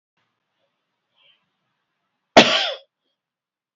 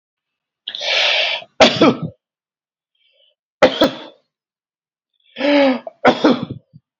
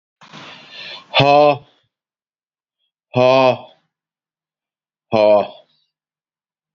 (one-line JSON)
{"cough_length": "3.8 s", "cough_amplitude": 28847, "cough_signal_mean_std_ratio": 0.2, "three_cough_length": "7.0 s", "three_cough_amplitude": 32767, "three_cough_signal_mean_std_ratio": 0.42, "exhalation_length": "6.7 s", "exhalation_amplitude": 28721, "exhalation_signal_mean_std_ratio": 0.34, "survey_phase": "beta (2021-08-13 to 2022-03-07)", "age": "45-64", "gender": "Male", "wearing_mask": "No", "symptom_none": true, "smoker_status": "Ex-smoker", "respiratory_condition_asthma": false, "respiratory_condition_other": false, "recruitment_source": "REACT", "submission_delay": "1 day", "covid_test_result": "Negative", "covid_test_method": "RT-qPCR", "influenza_a_test_result": "Negative", "influenza_b_test_result": "Negative"}